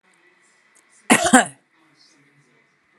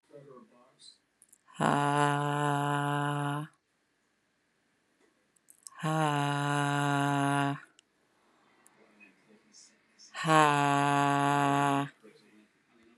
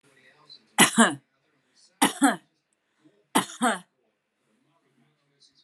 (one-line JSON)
{"cough_length": "3.0 s", "cough_amplitude": 32767, "cough_signal_mean_std_ratio": 0.24, "exhalation_length": "13.0 s", "exhalation_amplitude": 14623, "exhalation_signal_mean_std_ratio": 0.46, "three_cough_length": "5.6 s", "three_cough_amplitude": 24246, "three_cough_signal_mean_std_ratio": 0.28, "survey_phase": "alpha (2021-03-01 to 2021-08-12)", "age": "45-64", "gender": "Female", "wearing_mask": "No", "symptom_none": true, "smoker_status": "Ex-smoker", "respiratory_condition_asthma": false, "respiratory_condition_other": false, "recruitment_source": "REACT", "submission_delay": "3 days", "covid_test_result": "Negative", "covid_test_method": "RT-qPCR"}